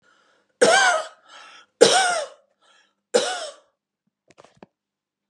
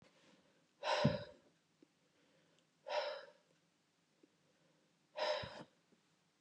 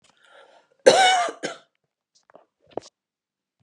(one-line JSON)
{"three_cough_length": "5.3 s", "three_cough_amplitude": 32720, "three_cough_signal_mean_std_ratio": 0.35, "exhalation_length": "6.4 s", "exhalation_amplitude": 3667, "exhalation_signal_mean_std_ratio": 0.33, "cough_length": "3.6 s", "cough_amplitude": 31567, "cough_signal_mean_std_ratio": 0.28, "survey_phase": "beta (2021-08-13 to 2022-03-07)", "age": "45-64", "gender": "Female", "wearing_mask": "No", "symptom_none": true, "smoker_status": "Ex-smoker", "respiratory_condition_asthma": false, "respiratory_condition_other": false, "recruitment_source": "REACT", "submission_delay": "1 day", "covid_test_result": "Negative", "covid_test_method": "RT-qPCR", "influenza_a_test_result": "Negative", "influenza_b_test_result": "Negative"}